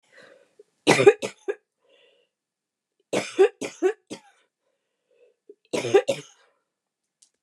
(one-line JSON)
{"three_cough_length": "7.4 s", "three_cough_amplitude": 27862, "three_cough_signal_mean_std_ratio": 0.27, "survey_phase": "beta (2021-08-13 to 2022-03-07)", "age": "45-64", "gender": "Female", "wearing_mask": "No", "symptom_none": true, "smoker_status": "Never smoked", "respiratory_condition_asthma": false, "respiratory_condition_other": false, "recruitment_source": "REACT", "submission_delay": "1 day", "covid_test_result": "Negative", "covid_test_method": "RT-qPCR", "influenza_a_test_result": "Negative", "influenza_b_test_result": "Negative"}